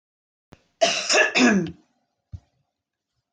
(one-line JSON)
{"cough_length": "3.3 s", "cough_amplitude": 18570, "cough_signal_mean_std_ratio": 0.4, "survey_phase": "beta (2021-08-13 to 2022-03-07)", "age": "45-64", "gender": "Female", "wearing_mask": "No", "symptom_none": true, "smoker_status": "Never smoked", "respiratory_condition_asthma": false, "respiratory_condition_other": false, "recruitment_source": "REACT", "submission_delay": "2 days", "covid_test_result": "Negative", "covid_test_method": "RT-qPCR"}